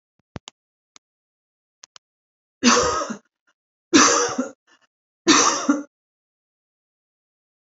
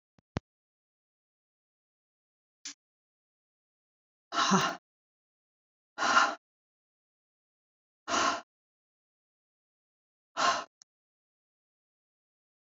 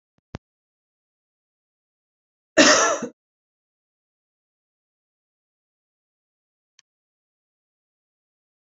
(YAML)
three_cough_length: 7.8 s
three_cough_amplitude: 27706
three_cough_signal_mean_std_ratio: 0.33
exhalation_length: 12.7 s
exhalation_amplitude: 9145
exhalation_signal_mean_std_ratio: 0.25
cough_length: 8.6 s
cough_amplitude: 28431
cough_signal_mean_std_ratio: 0.17
survey_phase: beta (2021-08-13 to 2022-03-07)
age: 45-64
gender: Female
wearing_mask: 'No'
symptom_runny_or_blocked_nose: true
symptom_shortness_of_breath: true
smoker_status: Never smoked
respiratory_condition_asthma: false
respiratory_condition_other: false
recruitment_source: REACT
submission_delay: 2 days
covid_test_result: Negative
covid_test_method: RT-qPCR
influenza_a_test_result: Unknown/Void
influenza_b_test_result: Unknown/Void